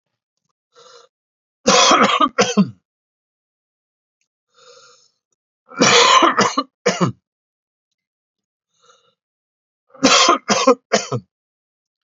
{
  "three_cough_length": "12.1 s",
  "three_cough_amplitude": 31751,
  "three_cough_signal_mean_std_ratio": 0.37,
  "survey_phase": "alpha (2021-03-01 to 2021-08-12)",
  "age": "45-64",
  "gender": "Male",
  "wearing_mask": "No",
  "symptom_cough_any": true,
  "symptom_fatigue": true,
  "symptom_headache": true,
  "smoker_status": "Never smoked",
  "respiratory_condition_asthma": false,
  "respiratory_condition_other": false,
  "recruitment_source": "Test and Trace",
  "submission_delay": "2 days",
  "covid_test_result": "Positive",
  "covid_test_method": "RT-qPCR",
  "covid_ct_value": 22.4,
  "covid_ct_gene": "ORF1ab gene",
  "covid_ct_mean": 23.1,
  "covid_viral_load": "27000 copies/ml",
  "covid_viral_load_category": "Low viral load (10K-1M copies/ml)"
}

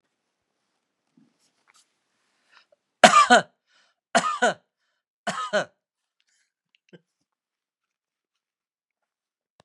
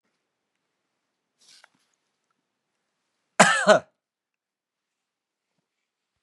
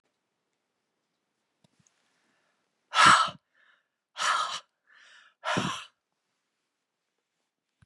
{
  "three_cough_length": "9.6 s",
  "three_cough_amplitude": 32768,
  "three_cough_signal_mean_std_ratio": 0.2,
  "cough_length": "6.2 s",
  "cough_amplitude": 31291,
  "cough_signal_mean_std_ratio": 0.17,
  "exhalation_length": "7.9 s",
  "exhalation_amplitude": 18136,
  "exhalation_signal_mean_std_ratio": 0.25,
  "survey_phase": "beta (2021-08-13 to 2022-03-07)",
  "age": "65+",
  "gender": "Male",
  "wearing_mask": "No",
  "symptom_none": true,
  "smoker_status": "Never smoked",
  "respiratory_condition_asthma": false,
  "respiratory_condition_other": false,
  "recruitment_source": "REACT",
  "submission_delay": "3 days",
  "covid_test_result": "Negative",
  "covid_test_method": "RT-qPCR"
}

